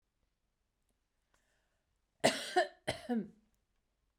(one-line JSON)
{"cough_length": "4.2 s", "cough_amplitude": 5756, "cough_signal_mean_std_ratio": 0.27, "survey_phase": "beta (2021-08-13 to 2022-03-07)", "age": "45-64", "gender": "Female", "wearing_mask": "No", "symptom_sore_throat": true, "symptom_onset": "12 days", "smoker_status": "Ex-smoker", "respiratory_condition_asthma": false, "respiratory_condition_other": false, "recruitment_source": "REACT", "submission_delay": "1 day", "covid_test_result": "Negative", "covid_test_method": "RT-qPCR", "influenza_a_test_result": "Negative", "influenza_b_test_result": "Negative"}